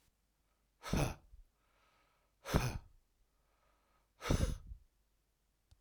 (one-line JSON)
{"exhalation_length": "5.8 s", "exhalation_amplitude": 6290, "exhalation_signal_mean_std_ratio": 0.32, "survey_phase": "alpha (2021-03-01 to 2021-08-12)", "age": "45-64", "gender": "Male", "wearing_mask": "No", "symptom_none": true, "smoker_status": "Ex-smoker", "respiratory_condition_asthma": false, "respiratory_condition_other": false, "recruitment_source": "REACT", "submission_delay": "1 day", "covid_test_result": "Negative", "covid_test_method": "RT-qPCR"}